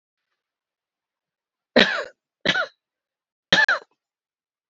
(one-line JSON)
{"three_cough_length": "4.7 s", "three_cough_amplitude": 30014, "three_cough_signal_mean_std_ratio": 0.27, "survey_phase": "beta (2021-08-13 to 2022-03-07)", "age": "18-44", "gender": "Female", "wearing_mask": "No", "symptom_cough_any": true, "symptom_runny_or_blocked_nose": true, "symptom_sore_throat": true, "symptom_fatigue": true, "symptom_change_to_sense_of_smell_or_taste": true, "symptom_onset": "3 days", "smoker_status": "Never smoked", "respiratory_condition_asthma": false, "respiratory_condition_other": false, "recruitment_source": "Test and Trace", "submission_delay": "2 days", "covid_test_result": "Positive", "covid_test_method": "RT-qPCR", "covid_ct_value": 23.3, "covid_ct_gene": "N gene"}